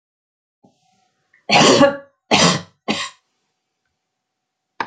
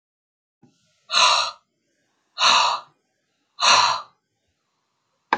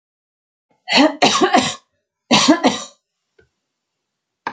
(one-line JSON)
{"three_cough_length": "4.9 s", "three_cough_amplitude": 32348, "three_cough_signal_mean_std_ratio": 0.34, "exhalation_length": "5.4 s", "exhalation_amplitude": 25645, "exhalation_signal_mean_std_ratio": 0.38, "cough_length": "4.5 s", "cough_amplitude": 30174, "cough_signal_mean_std_ratio": 0.4, "survey_phase": "alpha (2021-03-01 to 2021-08-12)", "age": "65+", "gender": "Female", "wearing_mask": "No", "symptom_none": true, "smoker_status": "Never smoked", "respiratory_condition_asthma": false, "respiratory_condition_other": false, "recruitment_source": "REACT", "submission_delay": "2 days", "covid_test_result": "Negative", "covid_test_method": "RT-qPCR"}